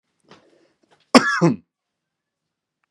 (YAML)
cough_length: 2.9 s
cough_amplitude: 32767
cough_signal_mean_std_ratio: 0.24
survey_phase: beta (2021-08-13 to 2022-03-07)
age: 18-44
gender: Male
wearing_mask: 'No'
symptom_none: true
smoker_status: Never smoked
respiratory_condition_asthma: false
respiratory_condition_other: false
recruitment_source: Test and Trace
submission_delay: 0 days
covid_test_result: Negative
covid_test_method: RT-qPCR